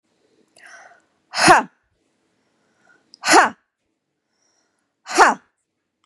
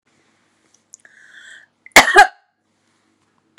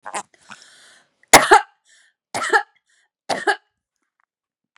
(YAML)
exhalation_length: 6.1 s
exhalation_amplitude: 32767
exhalation_signal_mean_std_ratio: 0.26
cough_length: 3.6 s
cough_amplitude: 32768
cough_signal_mean_std_ratio: 0.21
three_cough_length: 4.8 s
three_cough_amplitude: 32768
three_cough_signal_mean_std_ratio: 0.25
survey_phase: beta (2021-08-13 to 2022-03-07)
age: 18-44
gender: Female
wearing_mask: 'No'
symptom_fatigue: true
smoker_status: Never smoked
respiratory_condition_asthma: true
respiratory_condition_other: false
recruitment_source: REACT
submission_delay: 3 days
covid_test_result: Negative
covid_test_method: RT-qPCR
influenza_a_test_result: Negative
influenza_b_test_result: Negative